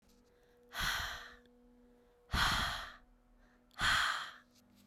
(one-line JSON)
{"exhalation_length": "4.9 s", "exhalation_amplitude": 3911, "exhalation_signal_mean_std_ratio": 0.48, "survey_phase": "beta (2021-08-13 to 2022-03-07)", "age": "18-44", "gender": "Female", "wearing_mask": "No", "symptom_cough_any": true, "symptom_fatigue": true, "symptom_change_to_sense_of_smell_or_taste": true, "symptom_loss_of_taste": true, "symptom_onset": "4 days", "smoker_status": "Never smoked", "respiratory_condition_asthma": false, "respiratory_condition_other": false, "recruitment_source": "Test and Trace", "submission_delay": "3 days", "covid_test_result": "Positive", "covid_test_method": "RT-qPCR"}